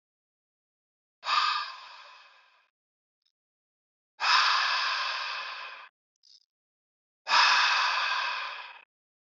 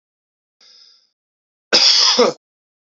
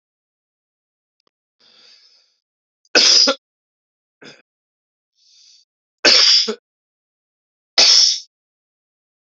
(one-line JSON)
{"exhalation_length": "9.2 s", "exhalation_amplitude": 14214, "exhalation_signal_mean_std_ratio": 0.47, "cough_length": "3.0 s", "cough_amplitude": 32768, "cough_signal_mean_std_ratio": 0.37, "three_cough_length": "9.3 s", "three_cough_amplitude": 32768, "three_cough_signal_mean_std_ratio": 0.3, "survey_phase": "beta (2021-08-13 to 2022-03-07)", "age": "18-44", "gender": "Male", "wearing_mask": "No", "symptom_cough_any": true, "symptom_new_continuous_cough": true, "symptom_runny_or_blocked_nose": true, "symptom_sore_throat": true, "symptom_fatigue": true, "symptom_fever_high_temperature": true, "symptom_headache": true, "symptom_change_to_sense_of_smell_or_taste": true, "symptom_loss_of_taste": true, "symptom_onset": "2 days", "smoker_status": "Current smoker (e-cigarettes or vapes only)", "respiratory_condition_asthma": false, "respiratory_condition_other": false, "recruitment_source": "Test and Trace", "submission_delay": "2 days", "covid_test_result": "Positive", "covid_test_method": "RT-qPCR", "covid_ct_value": 19.9, "covid_ct_gene": "ORF1ab gene", "covid_ct_mean": 20.4, "covid_viral_load": "210000 copies/ml", "covid_viral_load_category": "Low viral load (10K-1M copies/ml)"}